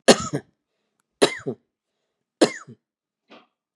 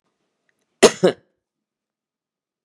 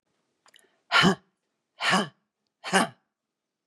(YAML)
three_cough_length: 3.8 s
three_cough_amplitude: 32767
three_cough_signal_mean_std_ratio: 0.23
cough_length: 2.6 s
cough_amplitude: 32768
cough_signal_mean_std_ratio: 0.18
exhalation_length: 3.7 s
exhalation_amplitude: 21065
exhalation_signal_mean_std_ratio: 0.32
survey_phase: beta (2021-08-13 to 2022-03-07)
age: 45-64
gender: Female
wearing_mask: 'No'
symptom_cough_any: true
symptom_shortness_of_breath: true
symptom_onset: 7 days
smoker_status: Never smoked
respiratory_condition_asthma: false
respiratory_condition_other: true
recruitment_source: Test and Trace
submission_delay: 3 days
covid_test_result: Negative
covid_test_method: RT-qPCR